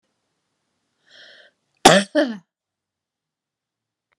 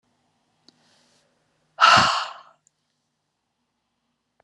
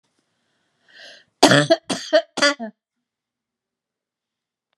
{
  "cough_length": "4.2 s",
  "cough_amplitude": 32768,
  "cough_signal_mean_std_ratio": 0.2,
  "exhalation_length": "4.4 s",
  "exhalation_amplitude": 25099,
  "exhalation_signal_mean_std_ratio": 0.24,
  "three_cough_length": "4.8 s",
  "three_cough_amplitude": 32768,
  "three_cough_signal_mean_std_ratio": 0.28,
  "survey_phase": "beta (2021-08-13 to 2022-03-07)",
  "age": "65+",
  "gender": "Female",
  "wearing_mask": "No",
  "symptom_none": true,
  "smoker_status": "Ex-smoker",
  "respiratory_condition_asthma": false,
  "respiratory_condition_other": false,
  "recruitment_source": "REACT",
  "submission_delay": "1 day",
  "covid_test_result": "Negative",
  "covid_test_method": "RT-qPCR",
  "influenza_a_test_result": "Negative",
  "influenza_b_test_result": "Negative"
}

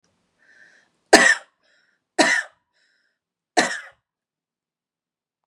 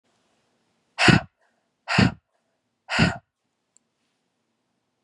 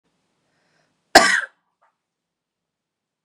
{
  "three_cough_length": "5.5 s",
  "three_cough_amplitude": 32768,
  "three_cough_signal_mean_std_ratio": 0.25,
  "exhalation_length": "5.0 s",
  "exhalation_amplitude": 29998,
  "exhalation_signal_mean_std_ratio": 0.27,
  "cough_length": "3.2 s",
  "cough_amplitude": 32768,
  "cough_signal_mean_std_ratio": 0.2,
  "survey_phase": "beta (2021-08-13 to 2022-03-07)",
  "age": "18-44",
  "gender": "Female",
  "wearing_mask": "No",
  "symptom_cough_any": true,
  "symptom_runny_or_blocked_nose": true,
  "symptom_sore_throat": true,
  "symptom_fatigue": true,
  "symptom_fever_high_temperature": true,
  "symptom_headache": true,
  "symptom_onset": "5 days",
  "smoker_status": "Current smoker (1 to 10 cigarettes per day)",
  "respiratory_condition_asthma": false,
  "respiratory_condition_other": false,
  "recruitment_source": "Test and Trace",
  "submission_delay": "2 days",
  "covid_test_result": "Positive",
  "covid_test_method": "RT-qPCR",
  "covid_ct_value": 20.7,
  "covid_ct_gene": "ORF1ab gene"
}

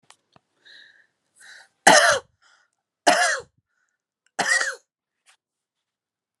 {
  "three_cough_length": "6.4 s",
  "three_cough_amplitude": 31829,
  "three_cough_signal_mean_std_ratio": 0.29,
  "survey_phase": "alpha (2021-03-01 to 2021-08-12)",
  "age": "18-44",
  "gender": "Female",
  "wearing_mask": "No",
  "symptom_none": true,
  "smoker_status": "Never smoked",
  "respiratory_condition_asthma": true,
  "respiratory_condition_other": false,
  "recruitment_source": "REACT",
  "submission_delay": "1 day",
  "covid_test_result": "Negative",
  "covid_test_method": "RT-qPCR"
}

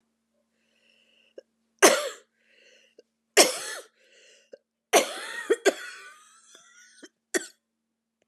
{
  "three_cough_length": "8.3 s",
  "three_cough_amplitude": 27844,
  "three_cough_signal_mean_std_ratio": 0.25,
  "survey_phase": "beta (2021-08-13 to 2022-03-07)",
  "age": "18-44",
  "gender": "Female",
  "wearing_mask": "No",
  "symptom_cough_any": true,
  "symptom_runny_or_blocked_nose": true,
  "symptom_shortness_of_breath": true,
  "symptom_sore_throat": true,
  "symptom_abdominal_pain": true,
  "symptom_fatigue": true,
  "symptom_fever_high_temperature": true,
  "symptom_headache": true,
  "smoker_status": "Never smoked",
  "respiratory_condition_asthma": false,
  "respiratory_condition_other": false,
  "recruitment_source": "Test and Trace",
  "submission_delay": "2 days",
  "covid_test_result": "Positive",
  "covid_test_method": "RT-qPCR",
  "covid_ct_value": 37.1,
  "covid_ct_gene": "ORF1ab gene"
}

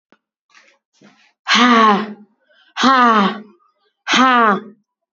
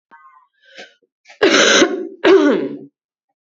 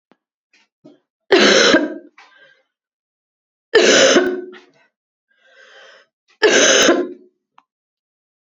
{
  "exhalation_length": "5.1 s",
  "exhalation_amplitude": 29437,
  "exhalation_signal_mean_std_ratio": 0.48,
  "cough_length": "3.5 s",
  "cough_amplitude": 31521,
  "cough_signal_mean_std_ratio": 0.47,
  "three_cough_length": "8.5 s",
  "three_cough_amplitude": 32768,
  "three_cough_signal_mean_std_ratio": 0.4,
  "survey_phase": "beta (2021-08-13 to 2022-03-07)",
  "age": "18-44",
  "gender": "Female",
  "wearing_mask": "No",
  "symptom_new_continuous_cough": true,
  "symptom_runny_or_blocked_nose": true,
  "symptom_abdominal_pain": true,
  "symptom_fatigue": true,
  "symptom_fever_high_temperature": true,
  "symptom_headache": true,
  "symptom_onset": "3 days",
  "smoker_status": "Never smoked",
  "respiratory_condition_asthma": false,
  "respiratory_condition_other": false,
  "recruitment_source": "Test and Trace",
  "submission_delay": "1 day",
  "covid_test_result": "Positive",
  "covid_test_method": "RT-qPCR",
  "covid_ct_value": 30.6,
  "covid_ct_gene": "N gene"
}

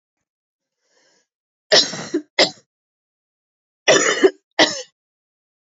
{
  "cough_length": "5.7 s",
  "cough_amplitude": 29492,
  "cough_signal_mean_std_ratio": 0.3,
  "survey_phase": "alpha (2021-03-01 to 2021-08-12)",
  "age": "18-44",
  "gender": "Female",
  "wearing_mask": "No",
  "symptom_cough_any": true,
  "symptom_fatigue": true,
  "symptom_headache": true,
  "symptom_change_to_sense_of_smell_or_taste": true,
  "symptom_onset": "3 days",
  "smoker_status": "Current smoker (e-cigarettes or vapes only)",
  "respiratory_condition_asthma": false,
  "respiratory_condition_other": false,
  "recruitment_source": "Test and Trace",
  "submission_delay": "2 days",
  "covid_test_result": "Positive",
  "covid_test_method": "RT-qPCR",
  "covid_ct_value": 16.4,
  "covid_ct_gene": "N gene",
  "covid_ct_mean": 16.6,
  "covid_viral_load": "3500000 copies/ml",
  "covid_viral_load_category": "High viral load (>1M copies/ml)"
}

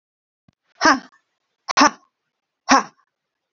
{
  "exhalation_length": "3.5 s",
  "exhalation_amplitude": 30581,
  "exhalation_signal_mean_std_ratio": 0.27,
  "survey_phase": "alpha (2021-03-01 to 2021-08-12)",
  "age": "45-64",
  "gender": "Female",
  "wearing_mask": "No",
  "symptom_none": true,
  "smoker_status": "Never smoked",
  "respiratory_condition_asthma": false,
  "respiratory_condition_other": false,
  "recruitment_source": "REACT",
  "submission_delay": "2 days",
  "covid_test_result": "Negative",
  "covid_test_method": "RT-qPCR"
}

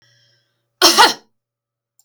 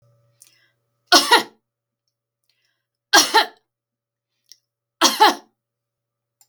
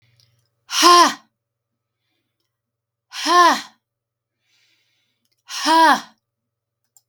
{
  "cough_length": "2.0 s",
  "cough_amplitude": 32768,
  "cough_signal_mean_std_ratio": 0.3,
  "three_cough_length": "6.5 s",
  "three_cough_amplitude": 32768,
  "three_cough_signal_mean_std_ratio": 0.26,
  "exhalation_length": "7.1 s",
  "exhalation_amplitude": 32768,
  "exhalation_signal_mean_std_ratio": 0.32,
  "survey_phase": "beta (2021-08-13 to 2022-03-07)",
  "age": "45-64",
  "gender": "Female",
  "wearing_mask": "No",
  "symptom_none": true,
  "symptom_onset": "8 days",
  "smoker_status": "Ex-smoker",
  "respiratory_condition_asthma": false,
  "respiratory_condition_other": false,
  "recruitment_source": "REACT",
  "submission_delay": "2 days",
  "covid_test_result": "Negative",
  "covid_test_method": "RT-qPCR",
  "influenza_a_test_result": "Negative",
  "influenza_b_test_result": "Negative"
}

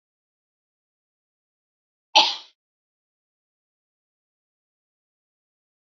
{
  "cough_length": "6.0 s",
  "cough_amplitude": 28929,
  "cough_signal_mean_std_ratio": 0.12,
  "survey_phase": "beta (2021-08-13 to 2022-03-07)",
  "age": "18-44",
  "gender": "Female",
  "wearing_mask": "No",
  "symptom_runny_or_blocked_nose": true,
  "smoker_status": "Never smoked",
  "respiratory_condition_asthma": false,
  "respiratory_condition_other": false,
  "recruitment_source": "REACT",
  "submission_delay": "2 days",
  "covid_test_result": "Negative",
  "covid_test_method": "RT-qPCR",
  "influenza_a_test_result": "Negative",
  "influenza_b_test_result": "Negative"
}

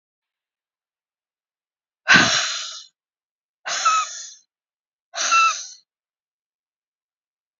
{
  "exhalation_length": "7.6 s",
  "exhalation_amplitude": 29534,
  "exhalation_signal_mean_std_ratio": 0.33,
  "survey_phase": "beta (2021-08-13 to 2022-03-07)",
  "age": "65+",
  "gender": "Female",
  "wearing_mask": "No",
  "symptom_cough_any": true,
  "symptom_runny_or_blocked_nose": true,
  "symptom_fatigue": true,
  "symptom_fever_high_temperature": true,
  "symptom_headache": true,
  "symptom_other": true,
  "smoker_status": "Never smoked",
  "respiratory_condition_asthma": false,
  "respiratory_condition_other": false,
  "recruitment_source": "Test and Trace",
  "submission_delay": "2 days",
  "covid_test_result": "Positive",
  "covid_test_method": "RT-qPCR",
  "covid_ct_value": 20.6,
  "covid_ct_gene": "ORF1ab gene"
}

